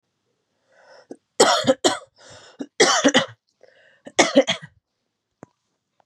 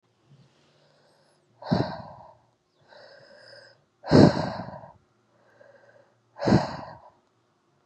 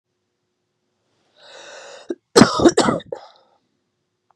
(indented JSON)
{
  "three_cough_length": "6.1 s",
  "three_cough_amplitude": 31872,
  "three_cough_signal_mean_std_ratio": 0.33,
  "exhalation_length": "7.9 s",
  "exhalation_amplitude": 26968,
  "exhalation_signal_mean_std_ratio": 0.26,
  "cough_length": "4.4 s",
  "cough_amplitude": 32768,
  "cough_signal_mean_std_ratio": 0.27,
  "survey_phase": "beta (2021-08-13 to 2022-03-07)",
  "age": "18-44",
  "gender": "Female",
  "wearing_mask": "No",
  "symptom_runny_or_blocked_nose": true,
  "symptom_fatigue": true,
  "symptom_onset": "3 days",
  "smoker_status": "Current smoker (11 or more cigarettes per day)",
  "respiratory_condition_asthma": false,
  "respiratory_condition_other": false,
  "recruitment_source": "Test and Trace",
  "submission_delay": "2 days",
  "covid_test_result": "Positive",
  "covid_test_method": "ePCR"
}